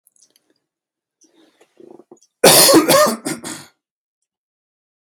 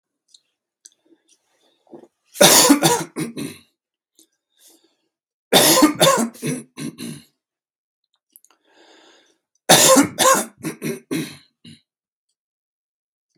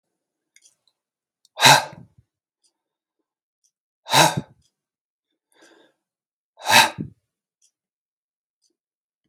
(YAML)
cough_length: 5.0 s
cough_amplitude: 32768
cough_signal_mean_std_ratio: 0.33
three_cough_length: 13.4 s
three_cough_amplitude: 32768
three_cough_signal_mean_std_ratio: 0.34
exhalation_length: 9.3 s
exhalation_amplitude: 32768
exhalation_signal_mean_std_ratio: 0.21
survey_phase: beta (2021-08-13 to 2022-03-07)
age: 45-64
gender: Male
wearing_mask: 'No'
symptom_none: true
smoker_status: Ex-smoker
respiratory_condition_asthma: true
respiratory_condition_other: false
recruitment_source: REACT
submission_delay: 4 days
covid_test_result: Negative
covid_test_method: RT-qPCR
influenza_a_test_result: Unknown/Void
influenza_b_test_result: Unknown/Void